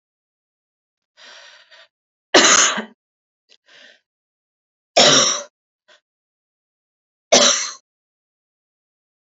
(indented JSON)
{
  "three_cough_length": "9.3 s",
  "three_cough_amplitude": 32767,
  "three_cough_signal_mean_std_ratio": 0.28,
  "survey_phase": "beta (2021-08-13 to 2022-03-07)",
  "age": "18-44",
  "gender": "Female",
  "wearing_mask": "No",
  "symptom_none": true,
  "smoker_status": "Never smoked",
  "respiratory_condition_asthma": false,
  "respiratory_condition_other": false,
  "recruitment_source": "REACT",
  "submission_delay": "2 days",
  "covid_test_result": "Negative",
  "covid_test_method": "RT-qPCR"
}